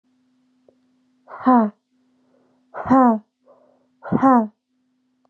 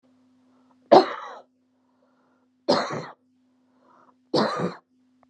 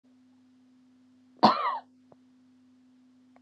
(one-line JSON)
{"exhalation_length": "5.3 s", "exhalation_amplitude": 24859, "exhalation_signal_mean_std_ratio": 0.34, "three_cough_length": "5.3 s", "three_cough_amplitude": 29108, "three_cough_signal_mean_std_ratio": 0.27, "cough_length": "3.4 s", "cough_amplitude": 18334, "cough_signal_mean_std_ratio": 0.24, "survey_phase": "beta (2021-08-13 to 2022-03-07)", "age": "18-44", "gender": "Female", "wearing_mask": "No", "symptom_none": true, "smoker_status": "Ex-smoker", "respiratory_condition_asthma": true, "respiratory_condition_other": false, "recruitment_source": "REACT", "submission_delay": "2 days", "covid_test_result": "Negative", "covid_test_method": "RT-qPCR", "influenza_a_test_result": "Negative", "influenza_b_test_result": "Negative"}